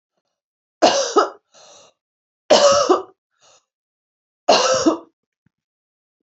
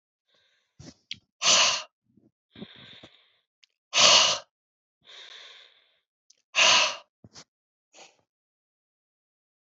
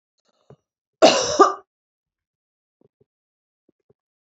{"three_cough_length": "6.3 s", "three_cough_amplitude": 29878, "three_cough_signal_mean_std_ratio": 0.37, "exhalation_length": "9.7 s", "exhalation_amplitude": 22282, "exhalation_signal_mean_std_ratio": 0.29, "cough_length": "4.4 s", "cough_amplitude": 28071, "cough_signal_mean_std_ratio": 0.23, "survey_phase": "beta (2021-08-13 to 2022-03-07)", "age": "65+", "gender": "Female", "wearing_mask": "No", "symptom_runny_or_blocked_nose": true, "smoker_status": "Ex-smoker", "respiratory_condition_asthma": false, "respiratory_condition_other": true, "recruitment_source": "REACT", "submission_delay": "2 days", "covid_test_result": "Negative", "covid_test_method": "RT-qPCR", "influenza_a_test_result": "Negative", "influenza_b_test_result": "Negative"}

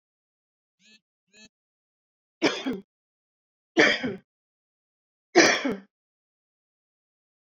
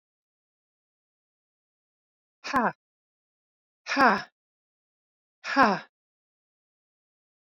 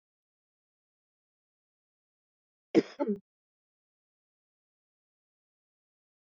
{"three_cough_length": "7.4 s", "three_cough_amplitude": 24898, "three_cough_signal_mean_std_ratio": 0.26, "exhalation_length": "7.5 s", "exhalation_amplitude": 18516, "exhalation_signal_mean_std_ratio": 0.23, "cough_length": "6.3 s", "cough_amplitude": 10031, "cough_signal_mean_std_ratio": 0.13, "survey_phase": "beta (2021-08-13 to 2022-03-07)", "age": "45-64", "gender": "Female", "wearing_mask": "No", "symptom_cough_any": true, "symptom_runny_or_blocked_nose": true, "smoker_status": "Never smoked", "respiratory_condition_asthma": false, "respiratory_condition_other": false, "recruitment_source": "REACT", "submission_delay": "2 days", "covid_test_result": "Negative", "covid_test_method": "RT-qPCR"}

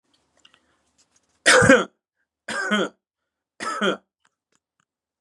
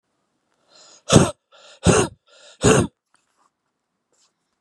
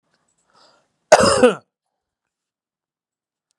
{"three_cough_length": "5.2 s", "three_cough_amplitude": 30105, "three_cough_signal_mean_std_ratio": 0.31, "exhalation_length": "4.6 s", "exhalation_amplitude": 32768, "exhalation_signal_mean_std_ratio": 0.29, "cough_length": "3.6 s", "cough_amplitude": 32768, "cough_signal_mean_std_ratio": 0.25, "survey_phase": "beta (2021-08-13 to 2022-03-07)", "age": "45-64", "gender": "Male", "wearing_mask": "No", "symptom_cough_any": true, "symptom_runny_or_blocked_nose": true, "symptom_shortness_of_breath": true, "symptom_abdominal_pain": true, "symptom_fatigue": true, "symptom_headache": true, "symptom_change_to_sense_of_smell_or_taste": true, "symptom_onset": "5 days", "smoker_status": "Current smoker (1 to 10 cigarettes per day)", "respiratory_condition_asthma": false, "respiratory_condition_other": false, "recruitment_source": "Test and Trace", "submission_delay": "2 days", "covid_test_result": "Positive", "covid_test_method": "RT-qPCR", "covid_ct_value": 14.0, "covid_ct_gene": "ORF1ab gene", "covid_ct_mean": 14.3, "covid_viral_load": "20000000 copies/ml", "covid_viral_load_category": "High viral load (>1M copies/ml)"}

